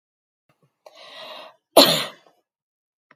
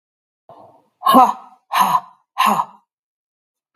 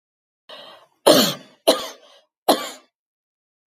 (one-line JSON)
{"cough_length": "3.2 s", "cough_amplitude": 32768, "cough_signal_mean_std_ratio": 0.23, "exhalation_length": "3.8 s", "exhalation_amplitude": 32768, "exhalation_signal_mean_std_ratio": 0.37, "three_cough_length": "3.7 s", "three_cough_amplitude": 32768, "three_cough_signal_mean_std_ratio": 0.3, "survey_phase": "beta (2021-08-13 to 2022-03-07)", "age": "45-64", "gender": "Female", "wearing_mask": "No", "symptom_none": true, "smoker_status": "Never smoked", "respiratory_condition_asthma": false, "respiratory_condition_other": false, "recruitment_source": "REACT", "submission_delay": "2 days", "covid_test_result": "Negative", "covid_test_method": "RT-qPCR"}